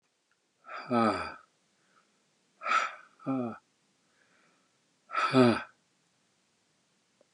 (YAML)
exhalation_length: 7.3 s
exhalation_amplitude: 12342
exhalation_signal_mean_std_ratio: 0.33
survey_phase: beta (2021-08-13 to 2022-03-07)
age: 65+
gender: Male
wearing_mask: 'No'
symptom_none: true
smoker_status: Ex-smoker
respiratory_condition_asthma: false
respiratory_condition_other: false
recruitment_source: REACT
submission_delay: 1 day
covid_test_result: Negative
covid_test_method: RT-qPCR
influenza_a_test_result: Negative
influenza_b_test_result: Negative